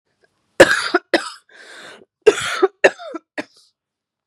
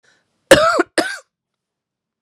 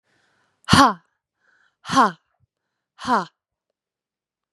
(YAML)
three_cough_length: 4.3 s
three_cough_amplitude: 32768
three_cough_signal_mean_std_ratio: 0.3
cough_length: 2.2 s
cough_amplitude: 32768
cough_signal_mean_std_ratio: 0.32
exhalation_length: 4.5 s
exhalation_amplitude: 32767
exhalation_signal_mean_std_ratio: 0.27
survey_phase: beta (2021-08-13 to 2022-03-07)
age: 18-44
gender: Female
wearing_mask: 'No'
symptom_cough_any: true
symptom_runny_or_blocked_nose: true
symptom_sore_throat: true
symptom_fatigue: true
symptom_other: true
symptom_onset: 3 days
smoker_status: Ex-smoker
respiratory_condition_asthma: false
respiratory_condition_other: false
recruitment_source: Test and Trace
submission_delay: 2 days
covid_test_result: Positive
covid_test_method: RT-qPCR